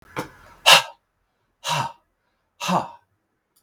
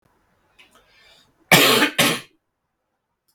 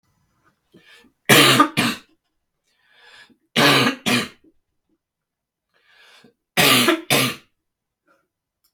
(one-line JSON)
{"exhalation_length": "3.6 s", "exhalation_amplitude": 32768, "exhalation_signal_mean_std_ratio": 0.29, "cough_length": "3.3 s", "cough_amplitude": 32768, "cough_signal_mean_std_ratio": 0.33, "three_cough_length": "8.7 s", "three_cough_amplitude": 32768, "three_cough_signal_mean_std_ratio": 0.36, "survey_phase": "beta (2021-08-13 to 2022-03-07)", "age": "45-64", "gender": "Male", "wearing_mask": "No", "symptom_cough_any": true, "symptom_runny_or_blocked_nose": true, "symptom_sore_throat": true, "smoker_status": "Never smoked", "respiratory_condition_asthma": false, "respiratory_condition_other": false, "recruitment_source": "Test and Trace", "submission_delay": "2 days", "covid_test_result": "Positive", "covid_test_method": "RT-qPCR", "covid_ct_value": 24.4, "covid_ct_gene": "N gene"}